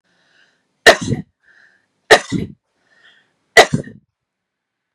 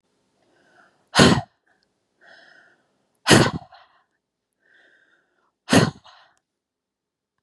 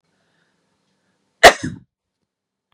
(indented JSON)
{
  "three_cough_length": "4.9 s",
  "three_cough_amplitude": 32768,
  "three_cough_signal_mean_std_ratio": 0.24,
  "exhalation_length": "7.4 s",
  "exhalation_amplitude": 32103,
  "exhalation_signal_mean_std_ratio": 0.24,
  "cough_length": "2.7 s",
  "cough_amplitude": 32768,
  "cough_signal_mean_std_ratio": 0.17,
  "survey_phase": "beta (2021-08-13 to 2022-03-07)",
  "age": "18-44",
  "gender": "Female",
  "wearing_mask": "No",
  "symptom_none": true,
  "smoker_status": "Never smoked",
  "respiratory_condition_asthma": false,
  "respiratory_condition_other": false,
  "recruitment_source": "REACT",
  "submission_delay": "2 days",
  "covid_test_result": "Negative",
  "covid_test_method": "RT-qPCR",
  "influenza_a_test_result": "Unknown/Void",
  "influenza_b_test_result": "Unknown/Void"
}